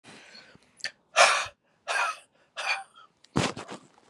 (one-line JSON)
{"exhalation_length": "4.1 s", "exhalation_amplitude": 20311, "exhalation_signal_mean_std_ratio": 0.37, "survey_phase": "beta (2021-08-13 to 2022-03-07)", "age": "45-64", "gender": "Male", "wearing_mask": "No", "symptom_cough_any": true, "symptom_runny_or_blocked_nose": true, "symptom_sore_throat": true, "symptom_onset": "3 days", "smoker_status": "Never smoked", "respiratory_condition_asthma": true, "respiratory_condition_other": false, "recruitment_source": "Test and Trace", "submission_delay": "2 days", "covid_test_result": "Positive", "covid_test_method": "ePCR"}